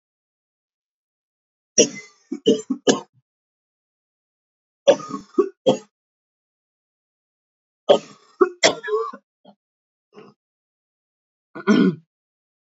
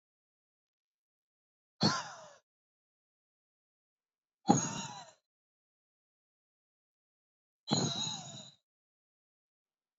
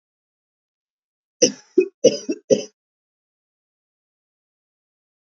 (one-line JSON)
{"cough_length": "12.7 s", "cough_amplitude": 28289, "cough_signal_mean_std_ratio": 0.26, "exhalation_length": "10.0 s", "exhalation_amplitude": 11192, "exhalation_signal_mean_std_ratio": 0.24, "three_cough_length": "5.2 s", "three_cough_amplitude": 30352, "three_cough_signal_mean_std_ratio": 0.21, "survey_phase": "beta (2021-08-13 to 2022-03-07)", "age": "18-44", "gender": "Female", "wearing_mask": "No", "symptom_cough_any": true, "symptom_new_continuous_cough": true, "symptom_runny_or_blocked_nose": true, "symptom_shortness_of_breath": true, "symptom_sore_throat": true, "symptom_fatigue": true, "symptom_headache": true, "symptom_onset": "4 days", "smoker_status": "Ex-smoker", "respiratory_condition_asthma": false, "respiratory_condition_other": false, "recruitment_source": "Test and Trace", "submission_delay": "1 day", "covid_test_result": "Positive", "covid_test_method": "RT-qPCR", "covid_ct_value": 21.9, "covid_ct_gene": "N gene"}